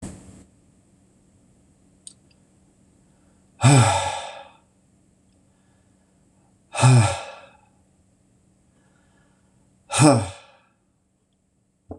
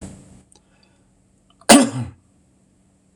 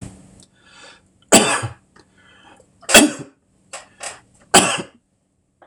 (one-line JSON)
{"exhalation_length": "12.0 s", "exhalation_amplitude": 26027, "exhalation_signal_mean_std_ratio": 0.27, "cough_length": "3.2 s", "cough_amplitude": 26028, "cough_signal_mean_std_ratio": 0.23, "three_cough_length": "5.7 s", "three_cough_amplitude": 26028, "three_cough_signal_mean_std_ratio": 0.29, "survey_phase": "beta (2021-08-13 to 2022-03-07)", "age": "45-64", "gender": "Male", "wearing_mask": "No", "symptom_none": true, "smoker_status": "Never smoked", "respiratory_condition_asthma": false, "respiratory_condition_other": false, "recruitment_source": "REACT", "submission_delay": "10 days", "covid_test_result": "Negative", "covid_test_method": "RT-qPCR", "influenza_a_test_result": "Unknown/Void", "influenza_b_test_result": "Unknown/Void"}